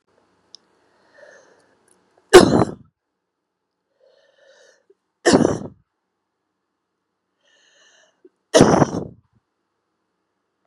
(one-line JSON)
{"three_cough_length": "10.7 s", "three_cough_amplitude": 32768, "three_cough_signal_mean_std_ratio": 0.22, "survey_phase": "beta (2021-08-13 to 2022-03-07)", "age": "45-64", "gender": "Female", "wearing_mask": "No", "symptom_none": true, "symptom_onset": "11 days", "smoker_status": "Current smoker (1 to 10 cigarettes per day)", "respiratory_condition_asthma": false, "respiratory_condition_other": false, "recruitment_source": "REACT", "submission_delay": "1 day", "covid_test_result": "Negative", "covid_test_method": "RT-qPCR", "influenza_a_test_result": "Negative", "influenza_b_test_result": "Negative"}